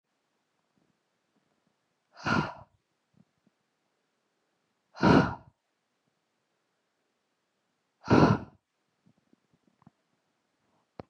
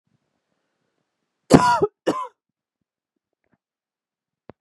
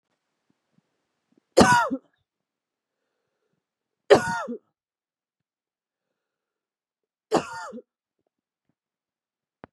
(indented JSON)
{
  "exhalation_length": "11.1 s",
  "exhalation_amplitude": 15306,
  "exhalation_signal_mean_std_ratio": 0.21,
  "cough_length": "4.6 s",
  "cough_amplitude": 32768,
  "cough_signal_mean_std_ratio": 0.23,
  "three_cough_length": "9.7 s",
  "three_cough_amplitude": 27016,
  "three_cough_signal_mean_std_ratio": 0.2,
  "survey_phase": "beta (2021-08-13 to 2022-03-07)",
  "age": "18-44",
  "gender": "Female",
  "wearing_mask": "No",
  "symptom_cough_any": true,
  "symptom_runny_or_blocked_nose": true,
  "symptom_shortness_of_breath": true,
  "symptom_sore_throat": true,
  "symptom_fatigue": true,
  "symptom_headache": true,
  "symptom_onset": "4 days",
  "smoker_status": "Ex-smoker",
  "respiratory_condition_asthma": false,
  "respiratory_condition_other": false,
  "recruitment_source": "Test and Trace",
  "submission_delay": "1 day",
  "covid_test_result": "Positive",
  "covid_test_method": "RT-qPCR",
  "covid_ct_value": 24.0,
  "covid_ct_gene": "N gene"
}